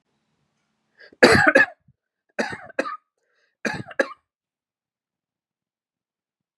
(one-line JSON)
{"three_cough_length": "6.6 s", "three_cough_amplitude": 32764, "three_cough_signal_mean_std_ratio": 0.25, "survey_phase": "beta (2021-08-13 to 2022-03-07)", "age": "45-64", "gender": "Male", "wearing_mask": "No", "symptom_cough_any": true, "symptom_runny_or_blocked_nose": true, "symptom_sore_throat": true, "symptom_fatigue": true, "symptom_fever_high_temperature": true, "symptom_headache": true, "symptom_onset": "2 days", "smoker_status": "Never smoked", "respiratory_condition_asthma": false, "respiratory_condition_other": false, "recruitment_source": "Test and Trace", "submission_delay": "2 days", "covid_test_result": "Positive", "covid_test_method": "RT-qPCR", "covid_ct_value": 18.0, "covid_ct_gene": "ORF1ab gene", "covid_ct_mean": 18.3, "covid_viral_load": "990000 copies/ml", "covid_viral_load_category": "Low viral load (10K-1M copies/ml)"}